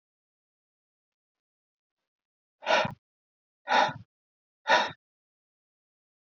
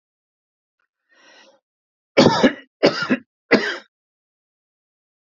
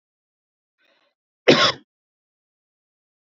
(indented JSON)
{
  "exhalation_length": "6.3 s",
  "exhalation_amplitude": 11602,
  "exhalation_signal_mean_std_ratio": 0.25,
  "three_cough_length": "5.2 s",
  "three_cough_amplitude": 32768,
  "three_cough_signal_mean_std_ratio": 0.29,
  "cough_length": "3.2 s",
  "cough_amplitude": 28506,
  "cough_signal_mean_std_ratio": 0.21,
  "survey_phase": "beta (2021-08-13 to 2022-03-07)",
  "age": "45-64",
  "gender": "Male",
  "wearing_mask": "No",
  "symptom_none": true,
  "smoker_status": "Ex-smoker",
  "respiratory_condition_asthma": false,
  "respiratory_condition_other": false,
  "recruitment_source": "REACT",
  "submission_delay": "3 days",
  "covid_test_result": "Negative",
  "covid_test_method": "RT-qPCR",
  "influenza_a_test_result": "Negative",
  "influenza_b_test_result": "Negative"
}